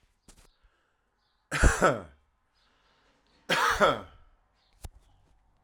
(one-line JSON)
{"cough_length": "5.6 s", "cough_amplitude": 13553, "cough_signal_mean_std_ratio": 0.31, "survey_phase": "alpha (2021-03-01 to 2021-08-12)", "age": "18-44", "gender": "Male", "wearing_mask": "No", "symptom_fatigue": true, "symptom_headache": true, "smoker_status": "Current smoker (e-cigarettes or vapes only)", "respiratory_condition_asthma": false, "respiratory_condition_other": false, "recruitment_source": "Test and Trace", "submission_delay": "1 day", "covid_test_result": "Positive", "covid_test_method": "RT-qPCR", "covid_ct_value": 20.1, "covid_ct_gene": "ORF1ab gene", "covid_ct_mean": 21.1, "covid_viral_load": "120000 copies/ml", "covid_viral_load_category": "Low viral load (10K-1M copies/ml)"}